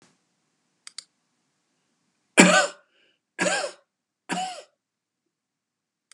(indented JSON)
{
  "three_cough_length": "6.1 s",
  "three_cough_amplitude": 32757,
  "three_cough_signal_mean_std_ratio": 0.25,
  "survey_phase": "beta (2021-08-13 to 2022-03-07)",
  "age": "65+",
  "gender": "Male",
  "wearing_mask": "No",
  "symptom_none": true,
  "smoker_status": "Never smoked",
  "respiratory_condition_asthma": false,
  "respiratory_condition_other": false,
  "recruitment_source": "REACT",
  "submission_delay": "1 day",
  "covid_test_result": "Negative",
  "covid_test_method": "RT-qPCR",
  "influenza_a_test_result": "Negative",
  "influenza_b_test_result": "Negative"
}